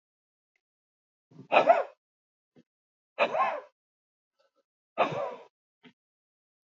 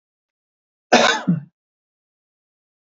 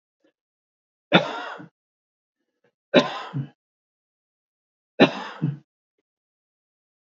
{"exhalation_length": "6.7 s", "exhalation_amplitude": 14298, "exhalation_signal_mean_std_ratio": 0.27, "cough_length": "3.0 s", "cough_amplitude": 29597, "cough_signal_mean_std_ratio": 0.28, "three_cough_length": "7.2 s", "three_cough_amplitude": 30827, "three_cough_signal_mean_std_ratio": 0.23, "survey_phase": "beta (2021-08-13 to 2022-03-07)", "age": "65+", "gender": "Male", "wearing_mask": "No", "symptom_none": true, "smoker_status": "Never smoked", "respiratory_condition_asthma": true, "respiratory_condition_other": false, "recruitment_source": "REACT", "submission_delay": "3 days", "covid_test_result": "Negative", "covid_test_method": "RT-qPCR"}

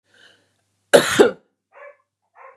{"cough_length": "2.6 s", "cough_amplitude": 32768, "cough_signal_mean_std_ratio": 0.27, "survey_phase": "beta (2021-08-13 to 2022-03-07)", "age": "45-64", "gender": "Female", "wearing_mask": "No", "symptom_cough_any": true, "symptom_runny_or_blocked_nose": true, "symptom_sore_throat": true, "symptom_fatigue": true, "smoker_status": "Never smoked", "respiratory_condition_asthma": false, "respiratory_condition_other": false, "recruitment_source": "Test and Trace", "submission_delay": "1 day", "covid_test_result": "Positive", "covid_test_method": "RT-qPCR", "covid_ct_value": 20.9, "covid_ct_gene": "ORF1ab gene", "covid_ct_mean": 21.4, "covid_viral_load": "96000 copies/ml", "covid_viral_load_category": "Low viral load (10K-1M copies/ml)"}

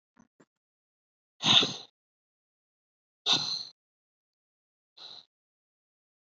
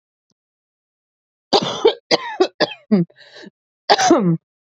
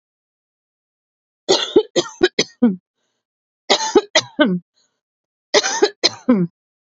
{"exhalation_length": "6.2 s", "exhalation_amplitude": 14649, "exhalation_signal_mean_std_ratio": 0.23, "cough_length": "4.7 s", "cough_amplitude": 30776, "cough_signal_mean_std_ratio": 0.4, "three_cough_length": "6.9 s", "three_cough_amplitude": 32186, "three_cough_signal_mean_std_ratio": 0.38, "survey_phase": "beta (2021-08-13 to 2022-03-07)", "age": "18-44", "gender": "Female", "wearing_mask": "No", "symptom_new_continuous_cough": true, "symptom_runny_or_blocked_nose": true, "symptom_sore_throat": true, "symptom_diarrhoea": true, "symptom_fatigue": true, "symptom_headache": true, "symptom_change_to_sense_of_smell_or_taste": true, "symptom_onset": "3 days", "smoker_status": "Never smoked", "respiratory_condition_asthma": false, "respiratory_condition_other": false, "recruitment_source": "Test and Trace", "submission_delay": "1 day", "covid_test_result": "Positive", "covid_test_method": "ePCR"}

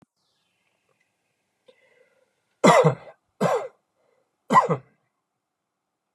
{"three_cough_length": "6.1 s", "three_cough_amplitude": 27966, "three_cough_signal_mean_std_ratio": 0.27, "survey_phase": "beta (2021-08-13 to 2022-03-07)", "age": "45-64", "gender": "Male", "wearing_mask": "No", "symptom_none": true, "smoker_status": "Never smoked", "respiratory_condition_asthma": false, "respiratory_condition_other": false, "recruitment_source": "REACT", "submission_delay": "2 days", "covid_test_result": "Negative", "covid_test_method": "RT-qPCR", "influenza_a_test_result": "Negative", "influenza_b_test_result": "Negative"}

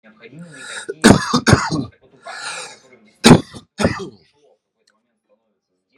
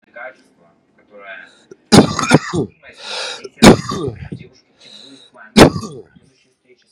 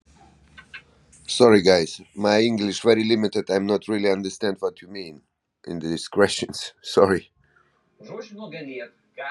{"cough_length": "6.0 s", "cough_amplitude": 32768, "cough_signal_mean_std_ratio": 0.32, "three_cough_length": "6.9 s", "three_cough_amplitude": 32768, "three_cough_signal_mean_std_ratio": 0.32, "exhalation_length": "9.3 s", "exhalation_amplitude": 28635, "exhalation_signal_mean_std_ratio": 0.49, "survey_phase": "beta (2021-08-13 to 2022-03-07)", "age": "18-44", "gender": "Male", "wearing_mask": "No", "symptom_cough_any": true, "smoker_status": "Current smoker (1 to 10 cigarettes per day)", "respiratory_condition_asthma": false, "respiratory_condition_other": false, "recruitment_source": "Test and Trace", "submission_delay": "2 days", "covid_test_result": "Positive", "covid_test_method": "RT-qPCR", "covid_ct_value": 17.3, "covid_ct_gene": "N gene", "covid_ct_mean": 17.5, "covid_viral_load": "1800000 copies/ml", "covid_viral_load_category": "High viral load (>1M copies/ml)"}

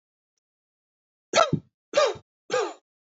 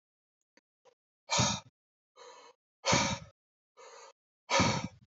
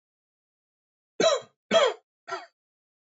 {"three_cough_length": "3.1 s", "three_cough_amplitude": 14460, "three_cough_signal_mean_std_ratio": 0.33, "exhalation_length": "5.1 s", "exhalation_amplitude": 6600, "exhalation_signal_mean_std_ratio": 0.36, "cough_length": "3.2 s", "cough_amplitude": 11761, "cough_signal_mean_std_ratio": 0.31, "survey_phase": "alpha (2021-03-01 to 2021-08-12)", "age": "18-44", "gender": "Male", "wearing_mask": "No", "symptom_none": true, "smoker_status": "Never smoked", "respiratory_condition_asthma": false, "respiratory_condition_other": false, "recruitment_source": "REACT", "submission_delay": "2 days", "covid_test_result": "Negative", "covid_test_method": "RT-qPCR"}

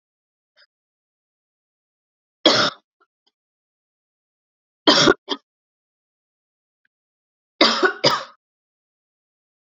{"three_cough_length": "9.7 s", "three_cough_amplitude": 31813, "three_cough_signal_mean_std_ratio": 0.24, "survey_phase": "beta (2021-08-13 to 2022-03-07)", "age": "45-64", "gender": "Female", "wearing_mask": "No", "symptom_cough_any": true, "symptom_runny_or_blocked_nose": true, "symptom_sore_throat": true, "symptom_abdominal_pain": true, "symptom_fatigue": true, "symptom_fever_high_temperature": true, "symptom_headache": true, "symptom_onset": "3 days", "smoker_status": "Never smoked", "respiratory_condition_asthma": false, "respiratory_condition_other": false, "recruitment_source": "Test and Trace", "submission_delay": "2 days", "covid_test_result": "Positive", "covid_test_method": "RT-qPCR", "covid_ct_value": 19.3, "covid_ct_gene": "N gene", "covid_ct_mean": 19.3, "covid_viral_load": "460000 copies/ml", "covid_viral_load_category": "Low viral load (10K-1M copies/ml)"}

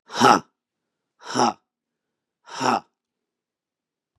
{"exhalation_length": "4.2 s", "exhalation_amplitude": 31115, "exhalation_signal_mean_std_ratio": 0.28, "survey_phase": "beta (2021-08-13 to 2022-03-07)", "age": "45-64", "gender": "Male", "wearing_mask": "No", "symptom_cough_any": true, "symptom_runny_or_blocked_nose": true, "symptom_shortness_of_breath": true, "symptom_sore_throat": true, "symptom_headache": true, "symptom_onset": "3 days", "smoker_status": "Ex-smoker", "respiratory_condition_asthma": false, "respiratory_condition_other": false, "recruitment_source": "Test and Trace", "submission_delay": "1 day", "covid_test_result": "Positive", "covid_test_method": "RT-qPCR", "covid_ct_value": 27.3, "covid_ct_gene": "N gene"}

